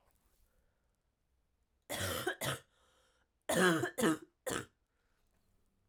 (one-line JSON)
{"cough_length": "5.9 s", "cough_amplitude": 5578, "cough_signal_mean_std_ratio": 0.36, "survey_phase": "alpha (2021-03-01 to 2021-08-12)", "age": "18-44", "gender": "Female", "wearing_mask": "No", "symptom_cough_any": true, "symptom_headache": true, "symptom_onset": "3 days", "smoker_status": "Never smoked", "respiratory_condition_asthma": false, "respiratory_condition_other": false, "recruitment_source": "Test and Trace", "submission_delay": "2 days", "covid_test_result": "Positive", "covid_test_method": "RT-qPCR", "covid_ct_value": 19.2, "covid_ct_gene": "ORF1ab gene"}